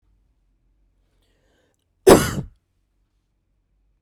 {"cough_length": "4.0 s", "cough_amplitude": 32768, "cough_signal_mean_std_ratio": 0.18, "survey_phase": "beta (2021-08-13 to 2022-03-07)", "age": "18-44", "gender": "Female", "wearing_mask": "No", "symptom_cough_any": true, "symptom_runny_or_blocked_nose": true, "symptom_headache": true, "symptom_change_to_sense_of_smell_or_taste": true, "symptom_onset": "4 days", "smoker_status": "Never smoked", "respiratory_condition_asthma": false, "respiratory_condition_other": false, "recruitment_source": "Test and Trace", "submission_delay": "2 days", "covid_test_result": "Positive", "covid_test_method": "RT-qPCR", "covid_ct_value": 20.3, "covid_ct_gene": "N gene", "covid_ct_mean": 21.1, "covid_viral_load": "120000 copies/ml", "covid_viral_load_category": "Low viral load (10K-1M copies/ml)"}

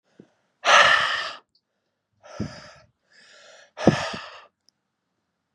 {"exhalation_length": "5.5 s", "exhalation_amplitude": 29698, "exhalation_signal_mean_std_ratio": 0.31, "survey_phase": "beta (2021-08-13 to 2022-03-07)", "age": "18-44", "gender": "Male", "wearing_mask": "No", "symptom_cough_any": true, "symptom_new_continuous_cough": true, "symptom_runny_or_blocked_nose": true, "symptom_sore_throat": true, "symptom_fatigue": true, "symptom_fever_high_temperature": true, "symptom_headache": true, "symptom_onset": "4 days", "smoker_status": "Never smoked", "respiratory_condition_asthma": false, "respiratory_condition_other": false, "recruitment_source": "Test and Trace", "submission_delay": "2 days", "covid_test_result": "Positive", "covid_test_method": "RT-qPCR", "covid_ct_value": 12.3, "covid_ct_gene": "N gene", "covid_ct_mean": 12.6, "covid_viral_load": "76000000 copies/ml", "covid_viral_load_category": "High viral load (>1M copies/ml)"}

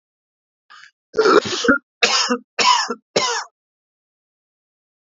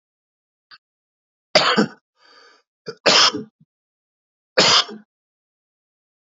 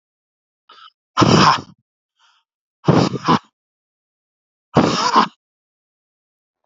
{"cough_length": "5.1 s", "cough_amplitude": 29305, "cough_signal_mean_std_ratio": 0.42, "three_cough_length": "6.4 s", "three_cough_amplitude": 28803, "three_cough_signal_mean_std_ratio": 0.3, "exhalation_length": "6.7 s", "exhalation_amplitude": 30889, "exhalation_signal_mean_std_ratio": 0.35, "survey_phase": "alpha (2021-03-01 to 2021-08-12)", "age": "18-44", "gender": "Male", "wearing_mask": "No", "symptom_none": true, "smoker_status": "Current smoker (1 to 10 cigarettes per day)", "respiratory_condition_asthma": false, "respiratory_condition_other": false, "recruitment_source": "REACT", "submission_delay": "7 days", "covid_test_result": "Negative", "covid_test_method": "RT-qPCR"}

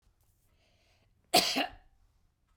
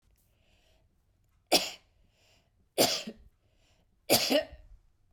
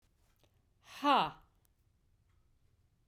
{"cough_length": "2.6 s", "cough_amplitude": 10837, "cough_signal_mean_std_ratio": 0.27, "three_cough_length": "5.1 s", "three_cough_amplitude": 12608, "three_cough_signal_mean_std_ratio": 0.3, "exhalation_length": "3.1 s", "exhalation_amplitude": 5274, "exhalation_signal_mean_std_ratio": 0.25, "survey_phase": "beta (2021-08-13 to 2022-03-07)", "age": "45-64", "gender": "Female", "wearing_mask": "No", "symptom_change_to_sense_of_smell_or_taste": true, "smoker_status": "Never smoked", "respiratory_condition_asthma": true, "respiratory_condition_other": false, "recruitment_source": "REACT", "submission_delay": "1 day", "covid_test_result": "Positive", "covid_test_method": "RT-qPCR", "covid_ct_value": 33.0, "covid_ct_gene": "E gene"}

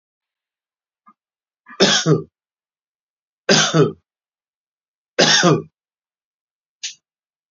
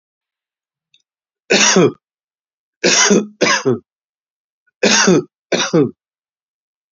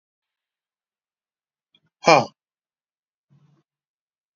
{"three_cough_length": "7.5 s", "three_cough_amplitude": 31994, "three_cough_signal_mean_std_ratio": 0.32, "cough_length": "6.9 s", "cough_amplitude": 32768, "cough_signal_mean_std_ratio": 0.43, "exhalation_length": "4.4 s", "exhalation_amplitude": 30536, "exhalation_signal_mean_std_ratio": 0.15, "survey_phase": "beta (2021-08-13 to 2022-03-07)", "age": "45-64", "gender": "Male", "wearing_mask": "No", "symptom_headache": true, "symptom_onset": "12 days", "smoker_status": "Current smoker (1 to 10 cigarettes per day)", "respiratory_condition_asthma": false, "respiratory_condition_other": false, "recruitment_source": "REACT", "submission_delay": "2 days", "covid_test_result": "Negative", "covid_test_method": "RT-qPCR"}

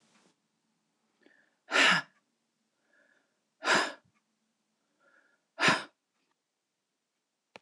{"exhalation_length": "7.6 s", "exhalation_amplitude": 8904, "exhalation_signal_mean_std_ratio": 0.25, "survey_phase": "beta (2021-08-13 to 2022-03-07)", "age": "65+", "gender": "Female", "wearing_mask": "No", "symptom_abdominal_pain": true, "symptom_diarrhoea": true, "symptom_fatigue": true, "smoker_status": "Ex-smoker", "respiratory_condition_asthma": false, "respiratory_condition_other": false, "recruitment_source": "REACT", "submission_delay": "2 days", "covid_test_result": "Negative", "covid_test_method": "RT-qPCR", "influenza_a_test_result": "Negative", "influenza_b_test_result": "Negative"}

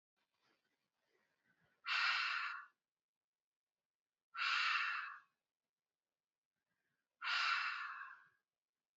{"exhalation_length": "9.0 s", "exhalation_amplitude": 2039, "exhalation_signal_mean_std_ratio": 0.42, "survey_phase": "beta (2021-08-13 to 2022-03-07)", "age": "18-44", "gender": "Female", "wearing_mask": "No", "symptom_none": true, "smoker_status": "Current smoker (11 or more cigarettes per day)", "respiratory_condition_asthma": false, "respiratory_condition_other": false, "recruitment_source": "REACT", "submission_delay": "3 days", "covid_test_result": "Negative", "covid_test_method": "RT-qPCR", "influenza_a_test_result": "Negative", "influenza_b_test_result": "Negative"}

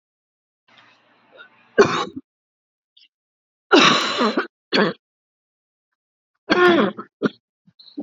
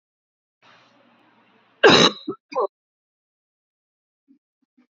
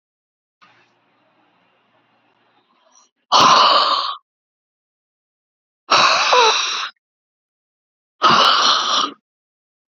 {"three_cough_length": "8.0 s", "three_cough_amplitude": 29283, "three_cough_signal_mean_std_ratio": 0.35, "cough_length": "4.9 s", "cough_amplitude": 29470, "cough_signal_mean_std_ratio": 0.22, "exhalation_length": "10.0 s", "exhalation_amplitude": 29782, "exhalation_signal_mean_std_ratio": 0.42, "survey_phase": "beta (2021-08-13 to 2022-03-07)", "age": "45-64", "gender": "Female", "wearing_mask": "No", "symptom_cough_any": true, "symptom_shortness_of_breath": true, "symptom_sore_throat": true, "symptom_fatigue": true, "symptom_headache": true, "symptom_loss_of_taste": true, "symptom_onset": "4 days", "smoker_status": "Never smoked", "respiratory_condition_asthma": true, "respiratory_condition_other": false, "recruitment_source": "Test and Trace", "submission_delay": "1 day", "covid_test_result": "Negative", "covid_test_method": "RT-qPCR"}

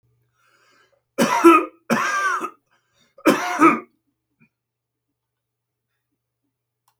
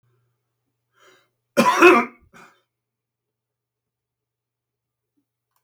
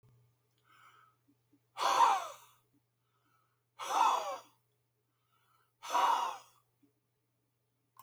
{"three_cough_length": "7.0 s", "three_cough_amplitude": 27548, "three_cough_signal_mean_std_ratio": 0.33, "cough_length": "5.6 s", "cough_amplitude": 28491, "cough_signal_mean_std_ratio": 0.22, "exhalation_length": "8.0 s", "exhalation_amplitude": 5153, "exhalation_signal_mean_std_ratio": 0.34, "survey_phase": "beta (2021-08-13 to 2022-03-07)", "age": "65+", "gender": "Male", "wearing_mask": "No", "symptom_none": true, "symptom_onset": "13 days", "smoker_status": "Ex-smoker", "respiratory_condition_asthma": false, "respiratory_condition_other": false, "recruitment_source": "REACT", "submission_delay": "1 day", "covid_test_result": "Negative", "covid_test_method": "RT-qPCR"}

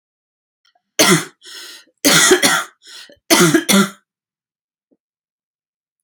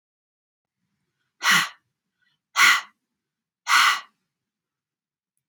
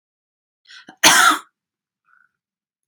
{"three_cough_length": "6.0 s", "three_cough_amplitude": 32768, "three_cough_signal_mean_std_ratio": 0.39, "exhalation_length": "5.5 s", "exhalation_amplitude": 22287, "exhalation_signal_mean_std_ratio": 0.3, "cough_length": "2.9 s", "cough_amplitude": 32329, "cough_signal_mean_std_ratio": 0.28, "survey_phase": "alpha (2021-03-01 to 2021-08-12)", "age": "45-64", "gender": "Female", "wearing_mask": "No", "symptom_none": true, "smoker_status": "Current smoker (e-cigarettes or vapes only)", "respiratory_condition_asthma": false, "respiratory_condition_other": false, "recruitment_source": "REACT", "submission_delay": "2 days", "covid_test_result": "Negative", "covid_test_method": "RT-qPCR"}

